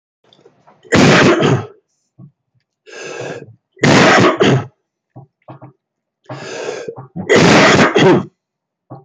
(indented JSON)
{
  "three_cough_length": "9.0 s",
  "three_cough_amplitude": 30845,
  "three_cough_signal_mean_std_ratio": 0.5,
  "survey_phase": "beta (2021-08-13 to 2022-03-07)",
  "age": "45-64",
  "gender": "Male",
  "wearing_mask": "No",
  "symptom_cough_any": true,
  "symptom_sore_throat": true,
  "symptom_onset": "2 days",
  "smoker_status": "Never smoked",
  "respiratory_condition_asthma": true,
  "respiratory_condition_other": false,
  "recruitment_source": "REACT",
  "submission_delay": "0 days",
  "covid_test_result": "Negative",
  "covid_test_method": "RT-qPCR",
  "covid_ct_value": 46.0,
  "covid_ct_gene": "N gene"
}